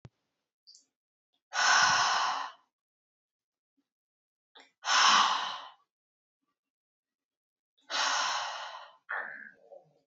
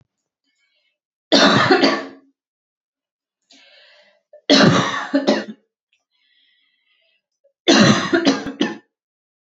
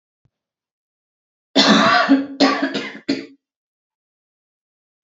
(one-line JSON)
{"exhalation_length": "10.1 s", "exhalation_amplitude": 9674, "exhalation_signal_mean_std_ratio": 0.39, "three_cough_length": "9.6 s", "three_cough_amplitude": 31380, "three_cough_signal_mean_std_ratio": 0.39, "cough_length": "5.0 s", "cough_amplitude": 30299, "cough_signal_mean_std_ratio": 0.39, "survey_phase": "beta (2021-08-13 to 2022-03-07)", "age": "18-44", "gender": "Female", "wearing_mask": "No", "symptom_none": true, "symptom_onset": "13 days", "smoker_status": "Never smoked", "respiratory_condition_asthma": false, "respiratory_condition_other": false, "recruitment_source": "REACT", "submission_delay": "1 day", "covid_test_result": "Negative", "covid_test_method": "RT-qPCR", "influenza_a_test_result": "Negative", "influenza_b_test_result": "Negative"}